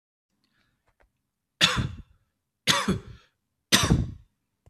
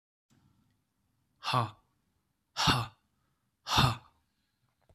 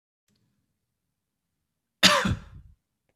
{"three_cough_length": "4.7 s", "three_cough_amplitude": 22230, "three_cough_signal_mean_std_ratio": 0.34, "exhalation_length": "4.9 s", "exhalation_amplitude": 9027, "exhalation_signal_mean_std_ratio": 0.31, "cough_length": "3.2 s", "cough_amplitude": 26672, "cough_signal_mean_std_ratio": 0.24, "survey_phase": "beta (2021-08-13 to 2022-03-07)", "age": "18-44", "gender": "Male", "wearing_mask": "No", "symptom_cough_any": true, "symptom_runny_or_blocked_nose": true, "symptom_sore_throat": true, "symptom_onset": "3 days", "smoker_status": "Ex-smoker", "respiratory_condition_asthma": false, "respiratory_condition_other": false, "recruitment_source": "Test and Trace", "submission_delay": "2 days", "covid_test_result": "Positive", "covid_test_method": "RT-qPCR", "covid_ct_value": 23.4, "covid_ct_gene": "N gene"}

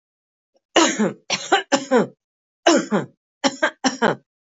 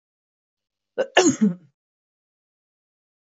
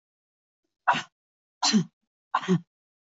{"three_cough_length": "4.5 s", "three_cough_amplitude": 25578, "three_cough_signal_mean_std_ratio": 0.45, "cough_length": "3.2 s", "cough_amplitude": 24228, "cough_signal_mean_std_ratio": 0.27, "exhalation_length": "3.1 s", "exhalation_amplitude": 13883, "exhalation_signal_mean_std_ratio": 0.33, "survey_phase": "beta (2021-08-13 to 2022-03-07)", "age": "45-64", "gender": "Female", "wearing_mask": "No", "symptom_sore_throat": true, "symptom_onset": "4 days", "smoker_status": "Never smoked", "respiratory_condition_asthma": false, "respiratory_condition_other": false, "recruitment_source": "REACT", "submission_delay": "1 day", "covid_test_result": "Negative", "covid_test_method": "RT-qPCR", "influenza_a_test_result": "Negative", "influenza_b_test_result": "Negative"}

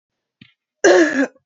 {"cough_length": "1.5 s", "cough_amplitude": 32719, "cough_signal_mean_std_ratio": 0.44, "survey_phase": "beta (2021-08-13 to 2022-03-07)", "age": "18-44", "gender": "Female", "wearing_mask": "No", "symptom_runny_or_blocked_nose": true, "symptom_sore_throat": true, "symptom_fatigue": true, "symptom_headache": true, "symptom_onset": "12 days", "smoker_status": "Never smoked", "respiratory_condition_asthma": false, "respiratory_condition_other": false, "recruitment_source": "REACT", "submission_delay": "2 days", "covid_test_result": "Negative", "covid_test_method": "RT-qPCR"}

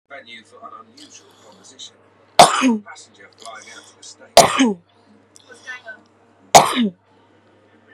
{"three_cough_length": "7.9 s", "three_cough_amplitude": 32768, "three_cough_signal_mean_std_ratio": 0.29, "survey_phase": "beta (2021-08-13 to 2022-03-07)", "age": "18-44", "gender": "Female", "wearing_mask": "No", "symptom_none": true, "smoker_status": "Current smoker (1 to 10 cigarettes per day)", "respiratory_condition_asthma": false, "respiratory_condition_other": false, "recruitment_source": "REACT", "submission_delay": "2 days", "covid_test_result": "Negative", "covid_test_method": "RT-qPCR"}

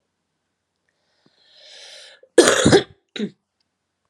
{"cough_length": "4.1 s", "cough_amplitude": 32768, "cough_signal_mean_std_ratio": 0.27, "survey_phase": "beta (2021-08-13 to 2022-03-07)", "age": "18-44", "gender": "Female", "wearing_mask": "No", "symptom_cough_any": true, "symptom_runny_or_blocked_nose": true, "symptom_shortness_of_breath": true, "symptom_fatigue": true, "symptom_headache": true, "symptom_onset": "5 days", "smoker_status": "Ex-smoker", "respiratory_condition_asthma": false, "respiratory_condition_other": false, "recruitment_source": "Test and Trace", "submission_delay": "2 days", "covid_test_result": "Positive", "covid_test_method": "RT-qPCR", "covid_ct_value": 26.6, "covid_ct_gene": "ORF1ab gene", "covid_ct_mean": 26.9, "covid_viral_load": "1500 copies/ml", "covid_viral_load_category": "Minimal viral load (< 10K copies/ml)"}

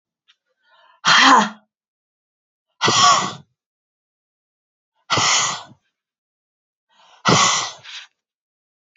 {"exhalation_length": "9.0 s", "exhalation_amplitude": 29785, "exhalation_signal_mean_std_ratio": 0.36, "survey_phase": "beta (2021-08-13 to 2022-03-07)", "age": "45-64", "gender": "Female", "wearing_mask": "No", "symptom_cough_any": true, "symptom_runny_or_blocked_nose": true, "symptom_sore_throat": true, "symptom_fatigue": true, "symptom_headache": true, "symptom_onset": "4 days", "smoker_status": "Never smoked", "respiratory_condition_asthma": false, "respiratory_condition_other": false, "recruitment_source": "Test and Trace", "submission_delay": "1 day", "covid_test_result": "Positive", "covid_test_method": "RT-qPCR", "covid_ct_value": 21.8, "covid_ct_gene": "N gene"}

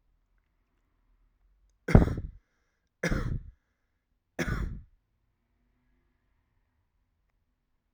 {"three_cough_length": "7.9 s", "three_cough_amplitude": 23133, "three_cough_signal_mean_std_ratio": 0.22, "survey_phase": "alpha (2021-03-01 to 2021-08-12)", "age": "18-44", "gender": "Male", "wearing_mask": "No", "symptom_cough_any": true, "symptom_fatigue": true, "symptom_fever_high_temperature": true, "symptom_loss_of_taste": true, "symptom_onset": "4 days", "smoker_status": "Never smoked", "respiratory_condition_asthma": false, "respiratory_condition_other": false, "recruitment_source": "Test and Trace", "submission_delay": "1 day", "covid_test_result": "Positive", "covid_test_method": "RT-qPCR", "covid_ct_value": 17.6, "covid_ct_gene": "ORF1ab gene"}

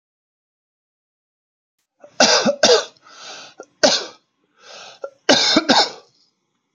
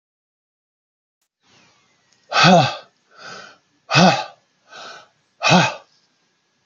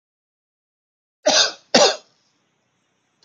{"three_cough_length": "6.7 s", "three_cough_amplitude": 32767, "three_cough_signal_mean_std_ratio": 0.36, "exhalation_length": "6.7 s", "exhalation_amplitude": 28872, "exhalation_signal_mean_std_ratio": 0.32, "cough_length": "3.2 s", "cough_amplitude": 29857, "cough_signal_mean_std_ratio": 0.29, "survey_phase": "alpha (2021-03-01 to 2021-08-12)", "age": "18-44", "gender": "Male", "wearing_mask": "No", "symptom_none": true, "smoker_status": "Never smoked", "respiratory_condition_asthma": false, "respiratory_condition_other": false, "recruitment_source": "REACT", "submission_delay": "1 day", "covid_test_result": "Negative", "covid_test_method": "RT-qPCR"}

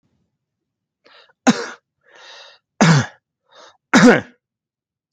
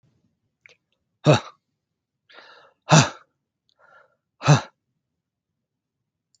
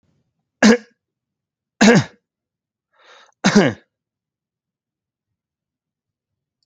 {"three_cough_length": "5.1 s", "three_cough_amplitude": 29966, "three_cough_signal_mean_std_ratio": 0.29, "exhalation_length": "6.4 s", "exhalation_amplitude": 28599, "exhalation_signal_mean_std_ratio": 0.21, "cough_length": "6.7 s", "cough_amplitude": 30065, "cough_signal_mean_std_ratio": 0.25, "survey_phase": "alpha (2021-03-01 to 2021-08-12)", "age": "45-64", "gender": "Male", "wearing_mask": "No", "symptom_none": true, "smoker_status": "Never smoked", "respiratory_condition_asthma": false, "respiratory_condition_other": false, "recruitment_source": "REACT", "submission_delay": "1 day", "covid_test_result": "Negative", "covid_test_method": "RT-qPCR"}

